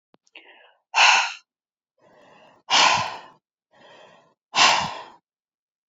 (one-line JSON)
{"exhalation_length": "5.9 s", "exhalation_amplitude": 25038, "exhalation_signal_mean_std_ratio": 0.35, "survey_phase": "alpha (2021-03-01 to 2021-08-12)", "age": "65+", "gender": "Female", "wearing_mask": "No", "symptom_none": true, "smoker_status": "Never smoked", "respiratory_condition_asthma": false, "respiratory_condition_other": false, "recruitment_source": "Test and Trace", "submission_delay": "2 days", "covid_test_result": "Negative", "covid_test_method": "RT-qPCR"}